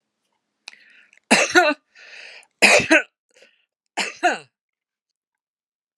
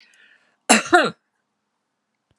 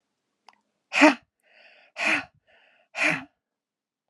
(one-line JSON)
{"three_cough_length": "6.0 s", "three_cough_amplitude": 32767, "three_cough_signal_mean_std_ratio": 0.31, "cough_length": "2.4 s", "cough_amplitude": 32767, "cough_signal_mean_std_ratio": 0.27, "exhalation_length": "4.1 s", "exhalation_amplitude": 28941, "exhalation_signal_mean_std_ratio": 0.28, "survey_phase": "alpha (2021-03-01 to 2021-08-12)", "age": "65+", "gender": "Female", "wearing_mask": "No", "symptom_cough_any": true, "smoker_status": "Ex-smoker", "respiratory_condition_asthma": true, "respiratory_condition_other": false, "recruitment_source": "REACT", "submission_delay": "2 days", "covid_test_result": "Negative", "covid_test_method": "RT-qPCR"}